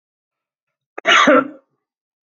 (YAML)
cough_length: 2.4 s
cough_amplitude: 32768
cough_signal_mean_std_ratio: 0.34
survey_phase: beta (2021-08-13 to 2022-03-07)
age: 45-64
gender: Male
wearing_mask: 'No'
symptom_none: true
smoker_status: Ex-smoker
respiratory_condition_asthma: false
respiratory_condition_other: false
recruitment_source: REACT
submission_delay: 3 days
covid_test_result: Negative
covid_test_method: RT-qPCR
influenza_a_test_result: Negative
influenza_b_test_result: Negative